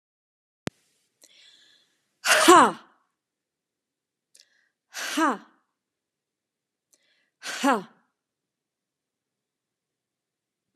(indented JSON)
{
  "exhalation_length": "10.8 s",
  "exhalation_amplitude": 27070,
  "exhalation_signal_mean_std_ratio": 0.22,
  "survey_phase": "alpha (2021-03-01 to 2021-08-12)",
  "age": "45-64",
  "gender": "Female",
  "wearing_mask": "No",
  "symptom_fatigue": true,
  "smoker_status": "Never smoked",
  "respiratory_condition_asthma": true,
  "respiratory_condition_other": false,
  "recruitment_source": "REACT",
  "submission_delay": "2 days",
  "covid_test_result": "Negative",
  "covid_test_method": "RT-qPCR"
}